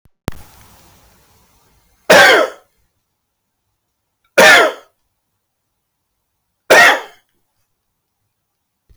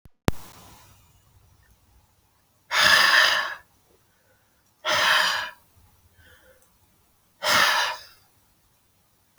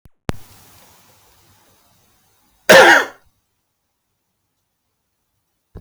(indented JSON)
{
  "three_cough_length": "9.0 s",
  "three_cough_amplitude": 32768,
  "three_cough_signal_mean_std_ratio": 0.3,
  "exhalation_length": "9.4 s",
  "exhalation_amplitude": 26819,
  "exhalation_signal_mean_std_ratio": 0.39,
  "cough_length": "5.8 s",
  "cough_amplitude": 32768,
  "cough_signal_mean_std_ratio": 0.22,
  "survey_phase": "beta (2021-08-13 to 2022-03-07)",
  "age": "45-64",
  "gender": "Male",
  "wearing_mask": "No",
  "symptom_none": true,
  "smoker_status": "Ex-smoker",
  "respiratory_condition_asthma": false,
  "respiratory_condition_other": false,
  "recruitment_source": "REACT",
  "submission_delay": "1 day",
  "covid_test_result": "Negative",
  "covid_test_method": "RT-qPCR"
}